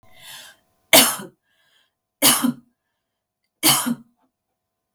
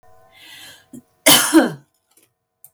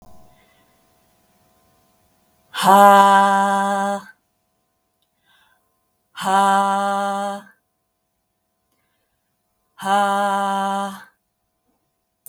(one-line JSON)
{"three_cough_length": "4.9 s", "three_cough_amplitude": 32768, "three_cough_signal_mean_std_ratio": 0.31, "cough_length": "2.7 s", "cough_amplitude": 32768, "cough_signal_mean_std_ratio": 0.32, "exhalation_length": "12.3 s", "exhalation_amplitude": 32766, "exhalation_signal_mean_std_ratio": 0.41, "survey_phase": "beta (2021-08-13 to 2022-03-07)", "age": "45-64", "gender": "Female", "wearing_mask": "No", "symptom_none": true, "smoker_status": "Ex-smoker", "respiratory_condition_asthma": true, "respiratory_condition_other": false, "recruitment_source": "Test and Trace", "submission_delay": "11 days", "covid_test_result": "Positive", "covid_test_method": "RT-qPCR", "covid_ct_value": 22.8, "covid_ct_gene": "ORF1ab gene"}